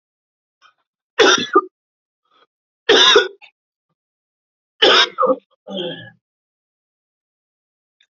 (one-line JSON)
{"three_cough_length": "8.2 s", "three_cough_amplitude": 32768, "three_cough_signal_mean_std_ratio": 0.32, "survey_phase": "beta (2021-08-13 to 2022-03-07)", "age": "45-64", "gender": "Male", "wearing_mask": "No", "symptom_cough_any": true, "symptom_runny_or_blocked_nose": true, "symptom_sore_throat": true, "symptom_fatigue": true, "symptom_fever_high_temperature": true, "symptom_headache": true, "symptom_onset": "6 days", "smoker_status": "Ex-smoker", "respiratory_condition_asthma": false, "respiratory_condition_other": false, "recruitment_source": "Test and Trace", "submission_delay": "2 days", "covid_test_result": "Positive", "covid_test_method": "ePCR"}